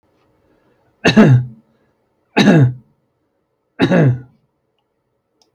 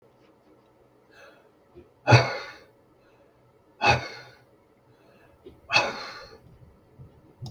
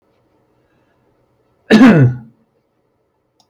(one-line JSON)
{"three_cough_length": "5.5 s", "three_cough_amplitude": 32768, "three_cough_signal_mean_std_ratio": 0.38, "exhalation_length": "7.5 s", "exhalation_amplitude": 24666, "exhalation_signal_mean_std_ratio": 0.26, "cough_length": "3.5 s", "cough_amplitude": 32768, "cough_signal_mean_std_ratio": 0.31, "survey_phase": "beta (2021-08-13 to 2022-03-07)", "age": "65+", "gender": "Male", "wearing_mask": "No", "symptom_cough_any": true, "smoker_status": "Never smoked", "respiratory_condition_asthma": true, "respiratory_condition_other": false, "recruitment_source": "REACT", "submission_delay": "0 days", "covid_test_result": "Negative", "covid_test_method": "RT-qPCR", "influenza_a_test_result": "Negative", "influenza_b_test_result": "Negative"}